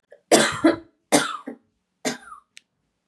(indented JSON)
{
  "three_cough_length": "3.1 s",
  "three_cough_amplitude": 29170,
  "three_cough_signal_mean_std_ratio": 0.36,
  "survey_phase": "beta (2021-08-13 to 2022-03-07)",
  "age": "18-44",
  "gender": "Female",
  "wearing_mask": "No",
  "symptom_runny_or_blocked_nose": true,
  "symptom_fatigue": true,
  "smoker_status": "Never smoked",
  "respiratory_condition_asthma": false,
  "respiratory_condition_other": false,
  "recruitment_source": "Test and Trace",
  "submission_delay": "0 days",
  "covid_test_result": "Positive",
  "covid_test_method": "LFT"
}